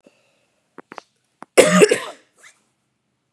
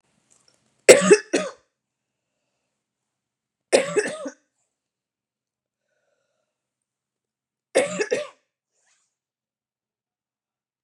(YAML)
cough_length: 3.3 s
cough_amplitude: 32768
cough_signal_mean_std_ratio: 0.27
three_cough_length: 10.8 s
three_cough_amplitude: 32768
three_cough_signal_mean_std_ratio: 0.2
survey_phase: beta (2021-08-13 to 2022-03-07)
age: 45-64
gender: Female
wearing_mask: 'Yes'
symptom_none: true
smoker_status: Current smoker (1 to 10 cigarettes per day)
respiratory_condition_asthma: false
respiratory_condition_other: false
recruitment_source: REACT
submission_delay: 4 days
covid_test_result: Negative
covid_test_method: RT-qPCR